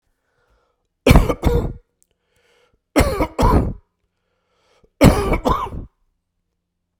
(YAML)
three_cough_length: 7.0 s
three_cough_amplitude: 32768
three_cough_signal_mean_std_ratio: 0.38
survey_phase: beta (2021-08-13 to 2022-03-07)
age: 45-64
gender: Male
wearing_mask: 'No'
symptom_cough_any: true
symptom_shortness_of_breath: true
symptom_fatigue: true
symptom_onset: 4 days
smoker_status: Ex-smoker
respiratory_condition_asthma: false
respiratory_condition_other: false
recruitment_source: Test and Trace
submission_delay: 2 days
covid_test_result: Positive
covid_test_method: RT-qPCR
covid_ct_value: 19.4
covid_ct_gene: ORF1ab gene